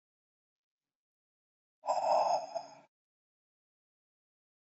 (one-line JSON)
{"exhalation_length": "4.7 s", "exhalation_amplitude": 3835, "exhalation_signal_mean_std_ratio": 0.31, "survey_phase": "beta (2021-08-13 to 2022-03-07)", "age": "18-44", "gender": "Male", "wearing_mask": "No", "symptom_none": true, "smoker_status": "Never smoked", "respiratory_condition_asthma": false, "respiratory_condition_other": false, "recruitment_source": "REACT", "submission_delay": "1 day", "covid_test_result": "Negative", "covid_test_method": "RT-qPCR", "covid_ct_value": 39.6, "covid_ct_gene": "N gene", "influenza_a_test_result": "Negative", "influenza_b_test_result": "Negative"}